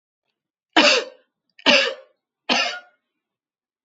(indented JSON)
{
  "three_cough_length": "3.8 s",
  "three_cough_amplitude": 29464,
  "three_cough_signal_mean_std_ratio": 0.35,
  "survey_phase": "beta (2021-08-13 to 2022-03-07)",
  "age": "65+",
  "gender": "Female",
  "wearing_mask": "No",
  "symptom_none": true,
  "smoker_status": "Ex-smoker",
  "respiratory_condition_asthma": false,
  "respiratory_condition_other": false,
  "recruitment_source": "REACT",
  "submission_delay": "1 day",
  "covid_test_result": "Negative",
  "covid_test_method": "RT-qPCR",
  "influenza_a_test_result": "Negative",
  "influenza_b_test_result": "Negative"
}